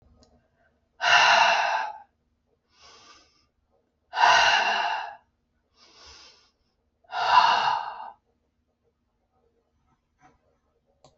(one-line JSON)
{"exhalation_length": "11.2 s", "exhalation_amplitude": 18261, "exhalation_signal_mean_std_ratio": 0.38, "survey_phase": "alpha (2021-03-01 to 2021-08-12)", "age": "65+", "gender": "Female", "wearing_mask": "No", "symptom_none": true, "smoker_status": "Never smoked", "respiratory_condition_asthma": false, "respiratory_condition_other": false, "recruitment_source": "REACT", "submission_delay": "1 day", "covid_test_result": "Negative", "covid_test_method": "RT-qPCR"}